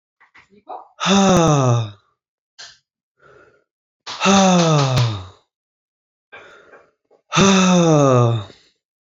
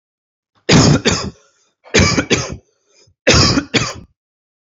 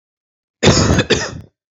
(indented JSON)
{
  "exhalation_length": "9.0 s",
  "exhalation_amplitude": 30386,
  "exhalation_signal_mean_std_ratio": 0.51,
  "three_cough_length": "4.8 s",
  "three_cough_amplitude": 32767,
  "three_cough_signal_mean_std_ratio": 0.46,
  "cough_length": "1.7 s",
  "cough_amplitude": 31279,
  "cough_signal_mean_std_ratio": 0.49,
  "survey_phase": "beta (2021-08-13 to 2022-03-07)",
  "age": "18-44",
  "gender": "Male",
  "wearing_mask": "No",
  "symptom_none": true,
  "smoker_status": "Never smoked",
  "respiratory_condition_asthma": false,
  "respiratory_condition_other": false,
  "recruitment_source": "REACT",
  "submission_delay": "1 day",
  "covid_test_result": "Negative",
  "covid_test_method": "RT-qPCR",
  "influenza_a_test_result": "Negative",
  "influenza_b_test_result": "Negative"
}